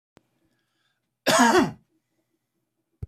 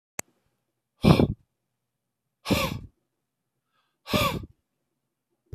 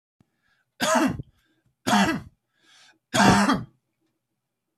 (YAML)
cough_length: 3.1 s
cough_amplitude: 17033
cough_signal_mean_std_ratio: 0.31
exhalation_length: 5.5 s
exhalation_amplitude: 22187
exhalation_signal_mean_std_ratio: 0.27
three_cough_length: 4.8 s
three_cough_amplitude: 23268
three_cough_signal_mean_std_ratio: 0.4
survey_phase: beta (2021-08-13 to 2022-03-07)
age: 45-64
gender: Male
wearing_mask: 'No'
symptom_none: true
smoker_status: Never smoked
respiratory_condition_asthma: false
respiratory_condition_other: false
recruitment_source: REACT
submission_delay: 2 days
covid_test_result: Negative
covid_test_method: RT-qPCR